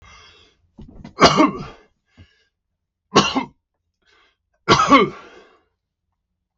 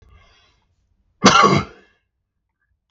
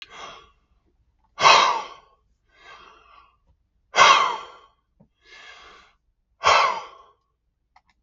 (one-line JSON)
{"three_cough_length": "6.6 s", "three_cough_amplitude": 32768, "three_cough_signal_mean_std_ratio": 0.31, "cough_length": "2.9 s", "cough_amplitude": 32768, "cough_signal_mean_std_ratio": 0.3, "exhalation_length": "8.0 s", "exhalation_amplitude": 32768, "exhalation_signal_mean_std_ratio": 0.31, "survey_phase": "beta (2021-08-13 to 2022-03-07)", "age": "65+", "gender": "Male", "wearing_mask": "No", "symptom_none": true, "smoker_status": "Ex-smoker", "respiratory_condition_asthma": true, "respiratory_condition_other": false, "recruitment_source": "REACT", "submission_delay": "0 days", "covid_test_result": "Negative", "covid_test_method": "RT-qPCR"}